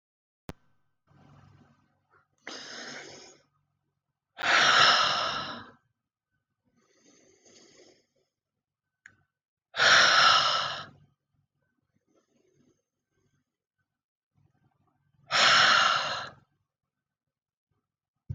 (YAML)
exhalation_length: 18.3 s
exhalation_amplitude: 14185
exhalation_signal_mean_std_ratio: 0.33
survey_phase: alpha (2021-03-01 to 2021-08-12)
age: 45-64
gender: Female
wearing_mask: 'No'
symptom_cough_any: true
symptom_shortness_of_breath: true
symptom_onset: 12 days
smoker_status: Never smoked
respiratory_condition_asthma: false
respiratory_condition_other: false
recruitment_source: REACT
submission_delay: 1 day
covid_test_result: Negative
covid_test_method: RT-qPCR